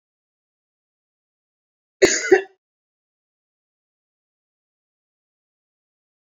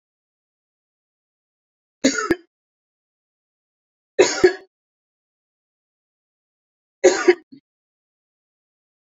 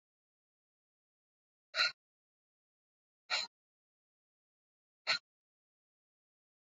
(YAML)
cough_length: 6.4 s
cough_amplitude: 28496
cough_signal_mean_std_ratio: 0.15
three_cough_length: 9.1 s
three_cough_amplitude: 28403
three_cough_signal_mean_std_ratio: 0.2
exhalation_length: 6.7 s
exhalation_amplitude: 4234
exhalation_signal_mean_std_ratio: 0.18
survey_phase: beta (2021-08-13 to 2022-03-07)
age: 45-64
gender: Female
wearing_mask: 'No'
symptom_cough_any: true
symptom_runny_or_blocked_nose: true
symptom_sore_throat: true
symptom_change_to_sense_of_smell_or_taste: true
smoker_status: Never smoked
respiratory_condition_asthma: false
respiratory_condition_other: false
recruitment_source: Test and Trace
submission_delay: 2 days
covid_test_result: Positive
covid_test_method: LFT